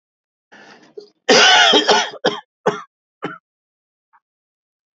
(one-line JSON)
{"cough_length": "4.9 s", "cough_amplitude": 32768, "cough_signal_mean_std_ratio": 0.37, "survey_phase": "beta (2021-08-13 to 2022-03-07)", "age": "45-64", "gender": "Male", "wearing_mask": "No", "symptom_cough_any": true, "symptom_new_continuous_cough": true, "symptom_runny_or_blocked_nose": true, "symptom_sore_throat": true, "symptom_diarrhoea": true, "symptom_headache": true, "symptom_change_to_sense_of_smell_or_taste": true, "symptom_onset": "2 days", "smoker_status": "Never smoked", "respiratory_condition_asthma": false, "respiratory_condition_other": false, "recruitment_source": "Test and Trace", "submission_delay": "1 day", "covid_test_result": "Positive", "covid_test_method": "RT-qPCR", "covid_ct_value": 17.1, "covid_ct_gene": "ORF1ab gene", "covid_ct_mean": 17.4, "covid_viral_load": "2000000 copies/ml", "covid_viral_load_category": "High viral load (>1M copies/ml)"}